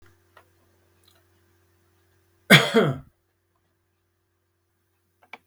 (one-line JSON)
{"cough_length": "5.5 s", "cough_amplitude": 32768, "cough_signal_mean_std_ratio": 0.19, "survey_phase": "beta (2021-08-13 to 2022-03-07)", "age": "65+", "gender": "Male", "wearing_mask": "No", "symptom_none": true, "smoker_status": "Never smoked", "respiratory_condition_asthma": false, "respiratory_condition_other": false, "recruitment_source": "REACT", "submission_delay": "3 days", "covid_test_result": "Negative", "covid_test_method": "RT-qPCR", "influenza_a_test_result": "Negative", "influenza_b_test_result": "Negative"}